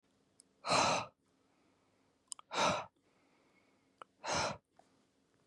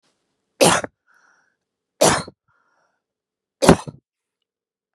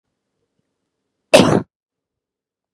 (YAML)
exhalation_length: 5.5 s
exhalation_amplitude: 4582
exhalation_signal_mean_std_ratio: 0.35
three_cough_length: 4.9 s
three_cough_amplitude: 32768
three_cough_signal_mean_std_ratio: 0.25
cough_length: 2.7 s
cough_amplitude: 32768
cough_signal_mean_std_ratio: 0.23
survey_phase: beta (2021-08-13 to 2022-03-07)
age: 18-44
gender: Female
wearing_mask: 'No'
symptom_none: true
smoker_status: Ex-smoker
respiratory_condition_asthma: false
respiratory_condition_other: false
recruitment_source: Test and Trace
submission_delay: 1 day
covid_test_result: Negative
covid_test_method: RT-qPCR